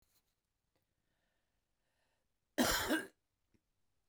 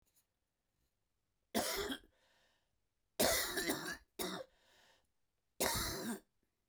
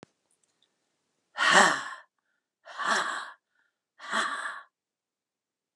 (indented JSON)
{
  "cough_length": "4.1 s",
  "cough_amplitude": 3498,
  "cough_signal_mean_std_ratio": 0.26,
  "three_cough_length": "6.7 s",
  "three_cough_amplitude": 4469,
  "three_cough_signal_mean_std_ratio": 0.43,
  "exhalation_length": "5.8 s",
  "exhalation_amplitude": 23852,
  "exhalation_signal_mean_std_ratio": 0.34,
  "survey_phase": "beta (2021-08-13 to 2022-03-07)",
  "age": "45-64",
  "gender": "Male",
  "wearing_mask": "No",
  "symptom_cough_any": true,
  "symptom_runny_or_blocked_nose": true,
  "symptom_diarrhoea": true,
  "symptom_fatigue": true,
  "symptom_fever_high_temperature": true,
  "symptom_headache": true,
  "symptom_change_to_sense_of_smell_or_taste": true,
  "symptom_onset": "3 days",
  "smoker_status": "Ex-smoker",
  "respiratory_condition_asthma": false,
  "respiratory_condition_other": false,
  "recruitment_source": "Test and Trace",
  "submission_delay": "2 days",
  "covid_test_result": "Positive",
  "covid_test_method": "RT-qPCR"
}